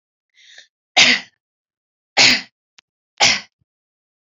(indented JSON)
{
  "three_cough_length": "4.4 s",
  "three_cough_amplitude": 32768,
  "three_cough_signal_mean_std_ratio": 0.3,
  "survey_phase": "alpha (2021-03-01 to 2021-08-12)",
  "age": "18-44",
  "gender": "Female",
  "wearing_mask": "No",
  "symptom_none": true,
  "smoker_status": "Never smoked",
  "respiratory_condition_asthma": false,
  "respiratory_condition_other": false,
  "recruitment_source": "Test and Trace",
  "submission_delay": "2 days",
  "covid_test_result": "Positive",
  "covid_test_method": "RT-qPCR",
  "covid_ct_value": 17.8,
  "covid_ct_gene": "ORF1ab gene",
  "covid_ct_mean": 18.3,
  "covid_viral_load": "1000000 copies/ml",
  "covid_viral_load_category": "High viral load (>1M copies/ml)"
}